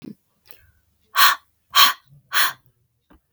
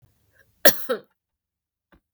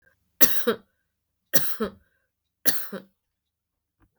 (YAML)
exhalation_length: 3.3 s
exhalation_amplitude: 32768
exhalation_signal_mean_std_ratio: 0.32
cough_length: 2.1 s
cough_amplitude: 32768
cough_signal_mean_std_ratio: 0.2
three_cough_length: 4.2 s
three_cough_amplitude: 32768
three_cough_signal_mean_std_ratio: 0.31
survey_phase: beta (2021-08-13 to 2022-03-07)
age: 18-44
gender: Female
wearing_mask: 'No'
symptom_runny_or_blocked_nose: true
symptom_sore_throat: true
symptom_abdominal_pain: true
symptom_fever_high_temperature: true
symptom_headache: true
symptom_onset: 2 days
smoker_status: Never smoked
respiratory_condition_asthma: false
respiratory_condition_other: false
recruitment_source: Test and Trace
submission_delay: 1 day
covid_test_result: Positive
covid_test_method: ePCR